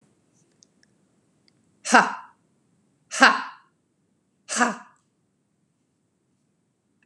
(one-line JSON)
{"exhalation_length": "7.1 s", "exhalation_amplitude": 31768, "exhalation_signal_mean_std_ratio": 0.21, "survey_phase": "beta (2021-08-13 to 2022-03-07)", "age": "45-64", "gender": "Female", "wearing_mask": "No", "symptom_none": true, "smoker_status": "Never smoked", "respiratory_condition_asthma": false, "respiratory_condition_other": false, "recruitment_source": "REACT", "submission_delay": "2 days", "covid_test_result": "Negative", "covid_test_method": "RT-qPCR"}